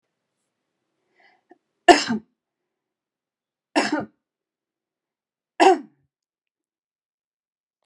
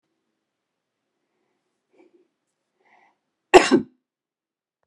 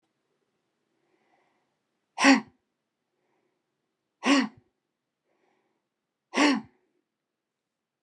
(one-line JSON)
{"three_cough_length": "7.9 s", "three_cough_amplitude": 32767, "three_cough_signal_mean_std_ratio": 0.19, "cough_length": "4.9 s", "cough_amplitude": 32768, "cough_signal_mean_std_ratio": 0.15, "exhalation_length": "8.0 s", "exhalation_amplitude": 16253, "exhalation_signal_mean_std_ratio": 0.23, "survey_phase": "beta (2021-08-13 to 2022-03-07)", "age": "65+", "gender": "Female", "wearing_mask": "No", "symptom_none": true, "smoker_status": "Never smoked", "respiratory_condition_asthma": false, "respiratory_condition_other": false, "recruitment_source": "REACT", "submission_delay": "2 days", "covid_test_result": "Negative", "covid_test_method": "RT-qPCR"}